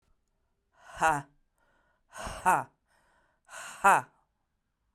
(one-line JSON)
{"exhalation_length": "4.9 s", "exhalation_amplitude": 11688, "exhalation_signal_mean_std_ratio": 0.28, "survey_phase": "beta (2021-08-13 to 2022-03-07)", "age": "45-64", "gender": "Female", "wearing_mask": "No", "symptom_cough_any": true, "symptom_runny_or_blocked_nose": true, "symptom_sore_throat": true, "symptom_abdominal_pain": true, "symptom_diarrhoea": true, "symptom_fatigue": true, "symptom_headache": true, "symptom_onset": "3 days", "smoker_status": "Current smoker (e-cigarettes or vapes only)", "respiratory_condition_asthma": false, "respiratory_condition_other": false, "recruitment_source": "Test and Trace", "submission_delay": "2 days", "covid_test_result": "Positive", "covid_test_method": "RT-qPCR", "covid_ct_value": 17.3, "covid_ct_gene": "ORF1ab gene", "covid_ct_mean": 18.4, "covid_viral_load": "920000 copies/ml", "covid_viral_load_category": "Low viral load (10K-1M copies/ml)"}